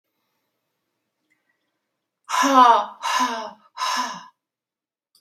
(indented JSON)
{
  "exhalation_length": "5.2 s",
  "exhalation_amplitude": 31006,
  "exhalation_signal_mean_std_ratio": 0.36,
  "survey_phase": "beta (2021-08-13 to 2022-03-07)",
  "age": "45-64",
  "gender": "Female",
  "wearing_mask": "No",
  "symptom_none": true,
  "smoker_status": "Never smoked",
  "respiratory_condition_asthma": false,
  "respiratory_condition_other": false,
  "recruitment_source": "REACT",
  "submission_delay": "6 days",
  "covid_test_result": "Negative",
  "covid_test_method": "RT-qPCR"
}